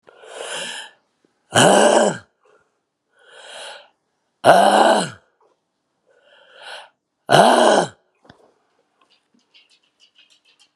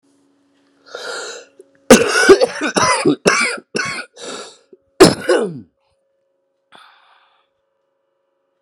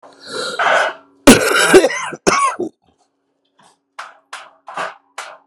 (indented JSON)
{
  "exhalation_length": "10.8 s",
  "exhalation_amplitude": 32768,
  "exhalation_signal_mean_std_ratio": 0.35,
  "three_cough_length": "8.6 s",
  "three_cough_amplitude": 32768,
  "three_cough_signal_mean_std_ratio": 0.36,
  "cough_length": "5.5 s",
  "cough_amplitude": 32768,
  "cough_signal_mean_std_ratio": 0.43,
  "survey_phase": "beta (2021-08-13 to 2022-03-07)",
  "age": "45-64",
  "gender": "Male",
  "wearing_mask": "No",
  "symptom_cough_any": true,
  "symptom_new_continuous_cough": true,
  "symptom_runny_or_blocked_nose": true,
  "symptom_shortness_of_breath": true,
  "symptom_sore_throat": true,
  "symptom_fatigue": true,
  "symptom_fever_high_temperature": true,
  "symptom_headache": true,
  "symptom_change_to_sense_of_smell_or_taste": true,
  "symptom_loss_of_taste": true,
  "symptom_onset": "3 days",
  "smoker_status": "Never smoked",
  "respiratory_condition_asthma": false,
  "respiratory_condition_other": false,
  "recruitment_source": "Test and Trace",
  "submission_delay": "2 days",
  "covid_test_result": "Positive",
  "covid_test_method": "RT-qPCR",
  "covid_ct_value": 22.3,
  "covid_ct_gene": "ORF1ab gene",
  "covid_ct_mean": 22.8,
  "covid_viral_load": "33000 copies/ml",
  "covid_viral_load_category": "Low viral load (10K-1M copies/ml)"
}